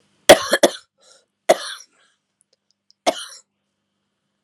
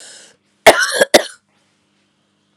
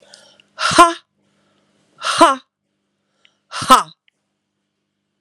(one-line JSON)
{"three_cough_length": "4.4 s", "three_cough_amplitude": 32768, "three_cough_signal_mean_std_ratio": 0.21, "cough_length": "2.6 s", "cough_amplitude": 32768, "cough_signal_mean_std_ratio": 0.29, "exhalation_length": "5.2 s", "exhalation_amplitude": 32768, "exhalation_signal_mean_std_ratio": 0.28, "survey_phase": "alpha (2021-03-01 to 2021-08-12)", "age": "45-64", "gender": "Female", "wearing_mask": "No", "symptom_cough_any": true, "symptom_fatigue": true, "smoker_status": "Never smoked", "respiratory_condition_asthma": false, "respiratory_condition_other": false, "recruitment_source": "Test and Trace", "submission_delay": "2 days", "covid_test_result": "Positive", "covid_test_method": "RT-qPCR", "covid_ct_value": 25.1, "covid_ct_gene": "ORF1ab gene", "covid_ct_mean": 25.6, "covid_viral_load": "3900 copies/ml", "covid_viral_load_category": "Minimal viral load (< 10K copies/ml)"}